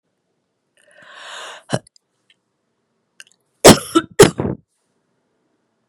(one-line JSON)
{"cough_length": "5.9 s", "cough_amplitude": 32768, "cough_signal_mean_std_ratio": 0.21, "survey_phase": "beta (2021-08-13 to 2022-03-07)", "age": "45-64", "gender": "Female", "wearing_mask": "No", "symptom_cough_any": true, "symptom_runny_or_blocked_nose": true, "symptom_fatigue": true, "symptom_headache": true, "symptom_onset": "3 days", "smoker_status": "Never smoked", "respiratory_condition_asthma": false, "respiratory_condition_other": false, "recruitment_source": "Test and Trace", "submission_delay": "2 days", "covid_test_result": "Positive", "covid_test_method": "RT-qPCR", "covid_ct_value": 17.7, "covid_ct_gene": "S gene", "covid_ct_mean": 18.3, "covid_viral_load": "1000000 copies/ml", "covid_viral_load_category": "High viral load (>1M copies/ml)"}